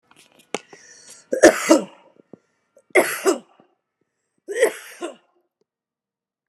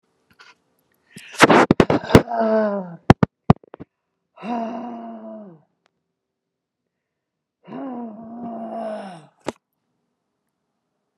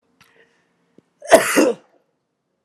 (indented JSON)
{
  "three_cough_length": "6.5 s",
  "three_cough_amplitude": 29204,
  "three_cough_signal_mean_std_ratio": 0.28,
  "exhalation_length": "11.2 s",
  "exhalation_amplitude": 29204,
  "exhalation_signal_mean_std_ratio": 0.29,
  "cough_length": "2.6 s",
  "cough_amplitude": 29204,
  "cough_signal_mean_std_ratio": 0.29,
  "survey_phase": "alpha (2021-03-01 to 2021-08-12)",
  "age": "45-64",
  "gender": "Female",
  "wearing_mask": "No",
  "symptom_none": true,
  "smoker_status": "Ex-smoker",
  "respiratory_condition_asthma": false,
  "respiratory_condition_other": false,
  "recruitment_source": "REACT",
  "submission_delay": "1 day",
  "covid_test_result": "Negative",
  "covid_test_method": "RT-qPCR"
}